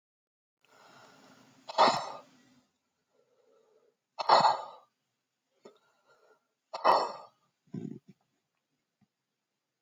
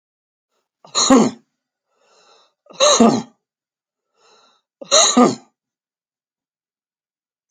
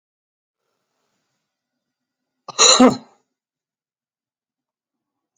exhalation_length: 9.8 s
exhalation_amplitude: 13610
exhalation_signal_mean_std_ratio: 0.25
three_cough_length: 7.5 s
three_cough_amplitude: 32767
three_cough_signal_mean_std_ratio: 0.31
cough_length: 5.4 s
cough_amplitude: 32768
cough_signal_mean_std_ratio: 0.2
survey_phase: alpha (2021-03-01 to 2021-08-12)
age: 65+
gender: Male
wearing_mask: 'No'
symptom_none: true
symptom_onset: 12 days
smoker_status: Never smoked
respiratory_condition_asthma: false
respiratory_condition_other: true
recruitment_source: REACT
submission_delay: 1 day
covid_test_result: Negative
covid_test_method: RT-qPCR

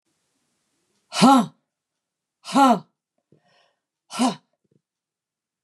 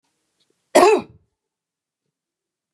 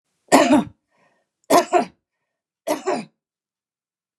exhalation_length: 5.6 s
exhalation_amplitude: 23286
exhalation_signal_mean_std_ratio: 0.28
cough_length: 2.7 s
cough_amplitude: 32767
cough_signal_mean_std_ratio: 0.24
three_cough_length: 4.2 s
three_cough_amplitude: 32767
three_cough_signal_mean_std_ratio: 0.34
survey_phase: beta (2021-08-13 to 2022-03-07)
age: 65+
gender: Female
wearing_mask: 'No'
symptom_none: true
smoker_status: Never smoked
respiratory_condition_asthma: false
respiratory_condition_other: false
recruitment_source: REACT
submission_delay: 1 day
covid_test_result: Negative
covid_test_method: RT-qPCR
influenza_a_test_result: Negative
influenza_b_test_result: Negative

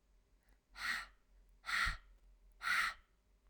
exhalation_length: 3.5 s
exhalation_amplitude: 2012
exhalation_signal_mean_std_ratio: 0.44
survey_phase: alpha (2021-03-01 to 2021-08-12)
age: 18-44
gender: Female
wearing_mask: 'No'
symptom_cough_any: true
symptom_fatigue: true
symptom_change_to_sense_of_smell_or_taste: true
symptom_loss_of_taste: true
smoker_status: Never smoked
respiratory_condition_asthma: false
respiratory_condition_other: false
recruitment_source: Test and Trace
submission_delay: 3 days
covid_test_method: RT-qPCR
covid_ct_value: 38.1
covid_ct_gene: N gene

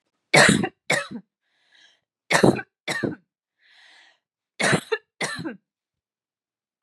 three_cough_length: 6.8 s
three_cough_amplitude: 29260
three_cough_signal_mean_std_ratio: 0.33
survey_phase: beta (2021-08-13 to 2022-03-07)
age: 18-44
gender: Female
wearing_mask: 'No'
symptom_sore_throat: true
symptom_fatigue: true
symptom_headache: true
symptom_other: true
smoker_status: Ex-smoker
respiratory_condition_asthma: false
respiratory_condition_other: false
recruitment_source: Test and Trace
submission_delay: 2 days
covid_test_result: Positive
covid_test_method: LFT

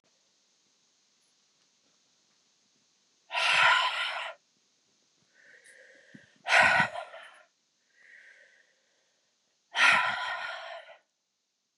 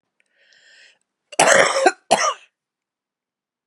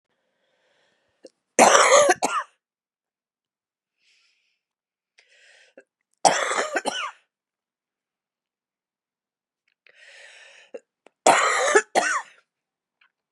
exhalation_length: 11.8 s
exhalation_amplitude: 12891
exhalation_signal_mean_std_ratio: 0.34
cough_length: 3.7 s
cough_amplitude: 32768
cough_signal_mean_std_ratio: 0.35
three_cough_length: 13.3 s
three_cough_amplitude: 32767
three_cough_signal_mean_std_ratio: 0.3
survey_phase: beta (2021-08-13 to 2022-03-07)
age: 45-64
gender: Female
wearing_mask: 'No'
symptom_cough_any: true
symptom_new_continuous_cough: true
symptom_runny_or_blocked_nose: true
symptom_sore_throat: true
symptom_fatigue: true
symptom_fever_high_temperature: true
symptom_headache: true
symptom_change_to_sense_of_smell_or_taste: true
symptom_loss_of_taste: true
smoker_status: Never smoked
respiratory_condition_asthma: false
respiratory_condition_other: false
recruitment_source: Test and Trace
submission_delay: 10 days
covid_test_result: Negative
covid_test_method: RT-qPCR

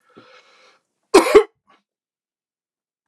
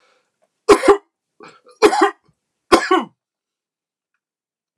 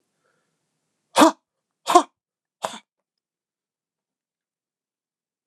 cough_length: 3.1 s
cough_amplitude: 29204
cough_signal_mean_std_ratio: 0.22
three_cough_length: 4.8 s
three_cough_amplitude: 29204
three_cough_signal_mean_std_ratio: 0.3
exhalation_length: 5.5 s
exhalation_amplitude: 29204
exhalation_signal_mean_std_ratio: 0.17
survey_phase: beta (2021-08-13 to 2022-03-07)
age: 45-64
gender: Male
wearing_mask: 'No'
symptom_none: true
smoker_status: Never smoked
respiratory_condition_asthma: true
respiratory_condition_other: false
recruitment_source: REACT
submission_delay: 3 days
covid_test_result: Negative
covid_test_method: RT-qPCR
influenza_a_test_result: Negative
influenza_b_test_result: Negative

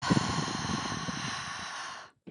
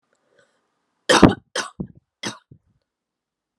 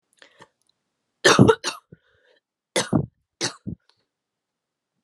exhalation_length: 2.3 s
exhalation_amplitude: 8548
exhalation_signal_mean_std_ratio: 0.8
three_cough_length: 3.6 s
three_cough_amplitude: 32768
three_cough_signal_mean_std_ratio: 0.22
cough_length: 5.0 s
cough_amplitude: 29310
cough_signal_mean_std_ratio: 0.25
survey_phase: alpha (2021-03-01 to 2021-08-12)
age: 18-44
gender: Female
wearing_mask: 'No'
symptom_cough_any: true
symptom_new_continuous_cough: true
symptom_headache: true
symptom_change_to_sense_of_smell_or_taste: true
symptom_loss_of_taste: true
symptom_onset: 2 days
smoker_status: Current smoker (1 to 10 cigarettes per day)
respiratory_condition_asthma: false
respiratory_condition_other: false
recruitment_source: Test and Trace
submission_delay: 1 day
covid_test_result: Positive
covid_test_method: RT-qPCR
covid_ct_value: 14.6
covid_ct_gene: S gene
covid_ct_mean: 17.0
covid_viral_load: 2700000 copies/ml
covid_viral_load_category: High viral load (>1M copies/ml)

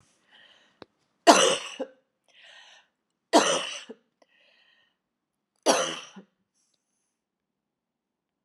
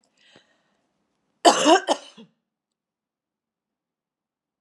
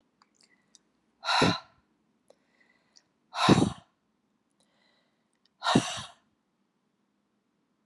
three_cough_length: 8.4 s
three_cough_amplitude: 29360
three_cough_signal_mean_std_ratio: 0.25
cough_length: 4.6 s
cough_amplitude: 30720
cough_signal_mean_std_ratio: 0.22
exhalation_length: 7.9 s
exhalation_amplitude: 13298
exhalation_signal_mean_std_ratio: 0.26
survey_phase: alpha (2021-03-01 to 2021-08-12)
age: 45-64
gender: Female
wearing_mask: 'No'
symptom_cough_any: true
symptom_fatigue: true
symptom_headache: true
symptom_onset: 7 days
smoker_status: Never smoked
respiratory_condition_asthma: false
respiratory_condition_other: false
recruitment_source: Test and Trace
submission_delay: 1 day
covid_test_result: Positive
covid_test_method: RT-qPCR
covid_ct_value: 25.9
covid_ct_gene: ORF1ab gene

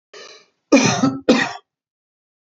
cough_length: 2.5 s
cough_amplitude: 28080
cough_signal_mean_std_ratio: 0.4
survey_phase: beta (2021-08-13 to 2022-03-07)
age: 45-64
gender: Male
wearing_mask: 'No'
symptom_none: true
smoker_status: Ex-smoker
respiratory_condition_asthma: false
respiratory_condition_other: false
recruitment_source: REACT
submission_delay: 1 day
covid_test_result: Negative
covid_test_method: RT-qPCR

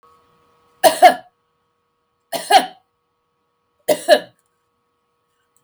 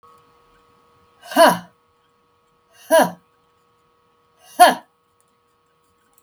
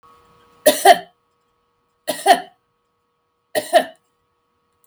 three_cough_length: 5.6 s
three_cough_amplitude: 32768
three_cough_signal_mean_std_ratio: 0.25
exhalation_length: 6.2 s
exhalation_amplitude: 32768
exhalation_signal_mean_std_ratio: 0.24
cough_length: 4.9 s
cough_amplitude: 32768
cough_signal_mean_std_ratio: 0.27
survey_phase: beta (2021-08-13 to 2022-03-07)
age: 65+
gender: Female
wearing_mask: 'No'
symptom_runny_or_blocked_nose: true
smoker_status: Never smoked
respiratory_condition_asthma: false
respiratory_condition_other: false
recruitment_source: Test and Trace
submission_delay: 2 days
covid_test_result: Positive
covid_test_method: RT-qPCR
covid_ct_value: 24.9
covid_ct_gene: ORF1ab gene
covid_ct_mean: 25.7
covid_viral_load: 3600 copies/ml
covid_viral_load_category: Minimal viral load (< 10K copies/ml)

